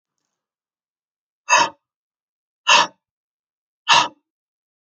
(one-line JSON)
{"exhalation_length": "4.9 s", "exhalation_amplitude": 30950, "exhalation_signal_mean_std_ratio": 0.26, "survey_phase": "alpha (2021-03-01 to 2021-08-12)", "age": "65+", "gender": "Female", "wearing_mask": "No", "symptom_none": true, "smoker_status": "Never smoked", "respiratory_condition_asthma": true, "respiratory_condition_other": false, "recruitment_source": "REACT", "submission_delay": "1 day", "covid_test_result": "Negative", "covid_test_method": "RT-qPCR"}